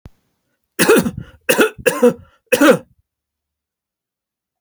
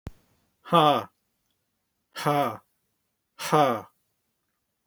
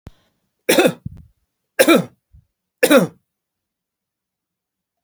{"cough_length": "4.6 s", "cough_amplitude": 32767, "cough_signal_mean_std_ratio": 0.36, "exhalation_length": "4.9 s", "exhalation_amplitude": 21514, "exhalation_signal_mean_std_ratio": 0.33, "three_cough_length": "5.0 s", "three_cough_amplitude": 32767, "three_cough_signal_mean_std_ratio": 0.29, "survey_phase": "beta (2021-08-13 to 2022-03-07)", "age": "65+", "gender": "Male", "wearing_mask": "No", "symptom_cough_any": true, "smoker_status": "Ex-smoker", "respiratory_condition_asthma": false, "respiratory_condition_other": false, "recruitment_source": "REACT", "submission_delay": "2 days", "covid_test_result": "Negative", "covid_test_method": "RT-qPCR", "influenza_a_test_result": "Negative", "influenza_b_test_result": "Negative"}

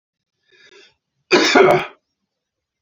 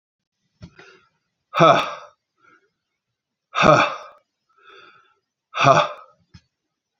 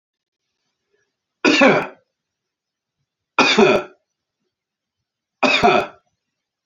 {"cough_length": "2.8 s", "cough_amplitude": 30340, "cough_signal_mean_std_ratio": 0.35, "exhalation_length": "7.0 s", "exhalation_amplitude": 28786, "exhalation_signal_mean_std_ratio": 0.3, "three_cough_length": "6.7 s", "three_cough_amplitude": 30430, "three_cough_signal_mean_std_ratio": 0.35, "survey_phase": "beta (2021-08-13 to 2022-03-07)", "age": "45-64", "gender": "Male", "wearing_mask": "No", "symptom_none": true, "smoker_status": "Ex-smoker", "respiratory_condition_asthma": false, "respiratory_condition_other": false, "recruitment_source": "REACT", "submission_delay": "3 days", "covid_test_result": "Negative", "covid_test_method": "RT-qPCR"}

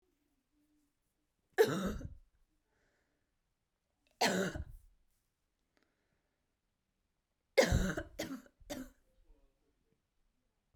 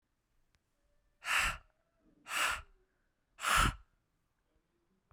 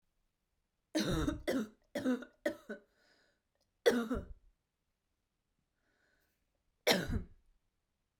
{"three_cough_length": "10.8 s", "three_cough_amplitude": 6444, "three_cough_signal_mean_std_ratio": 0.27, "exhalation_length": "5.1 s", "exhalation_amplitude": 4897, "exhalation_signal_mean_std_ratio": 0.34, "cough_length": "8.2 s", "cough_amplitude": 6132, "cough_signal_mean_std_ratio": 0.35, "survey_phase": "beta (2021-08-13 to 2022-03-07)", "age": "18-44", "gender": "Female", "wearing_mask": "No", "symptom_cough_any": true, "symptom_sore_throat": true, "symptom_onset": "4 days", "smoker_status": "Ex-smoker", "respiratory_condition_asthma": false, "respiratory_condition_other": false, "recruitment_source": "Test and Trace", "submission_delay": "1 day", "covid_test_result": "Negative", "covid_test_method": "RT-qPCR"}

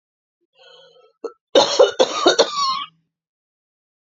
{"cough_length": "4.0 s", "cough_amplitude": 30780, "cough_signal_mean_std_ratio": 0.38, "survey_phase": "beta (2021-08-13 to 2022-03-07)", "age": "45-64", "gender": "Female", "wearing_mask": "No", "symptom_fatigue": true, "symptom_headache": true, "symptom_onset": "11 days", "smoker_status": "Never smoked", "respiratory_condition_asthma": false, "respiratory_condition_other": true, "recruitment_source": "REACT", "submission_delay": "1 day", "covid_test_result": "Negative", "covid_test_method": "RT-qPCR", "influenza_a_test_result": "Negative", "influenza_b_test_result": "Negative"}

